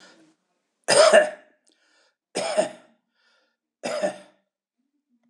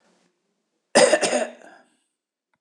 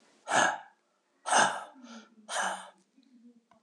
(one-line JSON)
{"three_cough_length": "5.3 s", "three_cough_amplitude": 25007, "three_cough_signal_mean_std_ratio": 0.31, "cough_length": "2.6 s", "cough_amplitude": 23912, "cough_signal_mean_std_ratio": 0.33, "exhalation_length": "3.6 s", "exhalation_amplitude": 10049, "exhalation_signal_mean_std_ratio": 0.4, "survey_phase": "beta (2021-08-13 to 2022-03-07)", "age": "65+", "gender": "Male", "wearing_mask": "No", "symptom_cough_any": true, "smoker_status": "Never smoked", "respiratory_condition_asthma": false, "respiratory_condition_other": false, "recruitment_source": "REACT", "submission_delay": "15 days", "covid_test_result": "Negative", "covid_test_method": "RT-qPCR", "influenza_a_test_result": "Negative", "influenza_b_test_result": "Negative"}